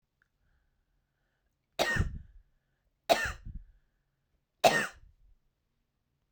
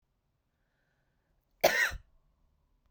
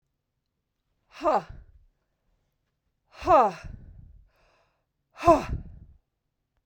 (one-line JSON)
{"three_cough_length": "6.3 s", "three_cough_amplitude": 15427, "three_cough_signal_mean_std_ratio": 0.27, "cough_length": "2.9 s", "cough_amplitude": 10591, "cough_signal_mean_std_ratio": 0.24, "exhalation_length": "6.7 s", "exhalation_amplitude": 19256, "exhalation_signal_mean_std_ratio": 0.27, "survey_phase": "beta (2021-08-13 to 2022-03-07)", "age": "45-64", "gender": "Female", "wearing_mask": "No", "symptom_none": true, "smoker_status": "Ex-smoker", "respiratory_condition_asthma": false, "respiratory_condition_other": false, "recruitment_source": "REACT", "submission_delay": "0 days", "covid_test_result": "Negative", "covid_test_method": "RT-qPCR"}